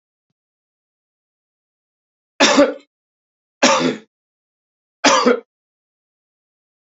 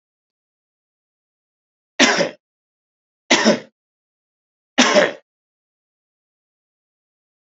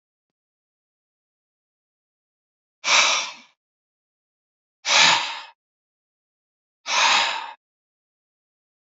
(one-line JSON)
{"three_cough_length": "7.0 s", "three_cough_amplitude": 32767, "three_cough_signal_mean_std_ratio": 0.29, "cough_length": "7.6 s", "cough_amplitude": 32768, "cough_signal_mean_std_ratio": 0.26, "exhalation_length": "8.9 s", "exhalation_amplitude": 27012, "exhalation_signal_mean_std_ratio": 0.31, "survey_phase": "beta (2021-08-13 to 2022-03-07)", "age": "45-64", "gender": "Male", "wearing_mask": "No", "symptom_none": true, "smoker_status": "Never smoked", "respiratory_condition_asthma": false, "respiratory_condition_other": false, "recruitment_source": "REACT", "submission_delay": "2 days", "covid_test_result": "Negative", "covid_test_method": "RT-qPCR", "influenza_a_test_result": "Negative", "influenza_b_test_result": "Negative"}